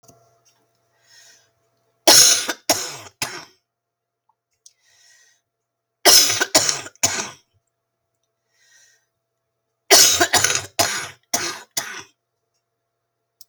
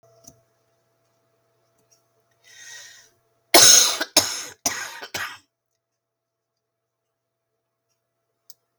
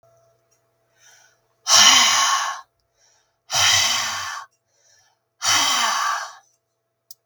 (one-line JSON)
{"three_cough_length": "13.5 s", "three_cough_amplitude": 32768, "three_cough_signal_mean_std_ratio": 0.31, "cough_length": "8.8 s", "cough_amplitude": 32768, "cough_signal_mean_std_ratio": 0.23, "exhalation_length": "7.3 s", "exhalation_amplitude": 32768, "exhalation_signal_mean_std_ratio": 0.47, "survey_phase": "beta (2021-08-13 to 2022-03-07)", "age": "65+", "gender": "Female", "wearing_mask": "No", "symptom_cough_any": true, "symptom_onset": "8 days", "smoker_status": "Ex-smoker", "respiratory_condition_asthma": false, "respiratory_condition_other": false, "recruitment_source": "REACT", "submission_delay": "1 day", "covid_test_result": "Negative", "covid_test_method": "RT-qPCR"}